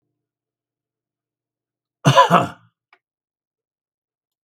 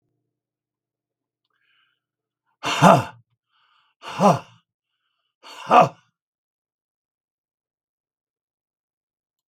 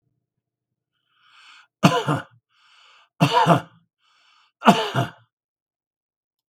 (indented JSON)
{
  "cough_length": "4.4 s",
  "cough_amplitude": 32768,
  "cough_signal_mean_std_ratio": 0.22,
  "exhalation_length": "9.5 s",
  "exhalation_amplitude": 32766,
  "exhalation_signal_mean_std_ratio": 0.21,
  "three_cough_length": "6.5 s",
  "three_cough_amplitude": 32768,
  "three_cough_signal_mean_std_ratio": 0.3,
  "survey_phase": "beta (2021-08-13 to 2022-03-07)",
  "age": "65+",
  "gender": "Male",
  "wearing_mask": "No",
  "symptom_none": true,
  "smoker_status": "Ex-smoker",
  "respiratory_condition_asthma": false,
  "respiratory_condition_other": false,
  "recruitment_source": "REACT",
  "submission_delay": "3 days",
  "covid_test_result": "Negative",
  "covid_test_method": "RT-qPCR",
  "influenza_a_test_result": "Negative",
  "influenza_b_test_result": "Negative"
}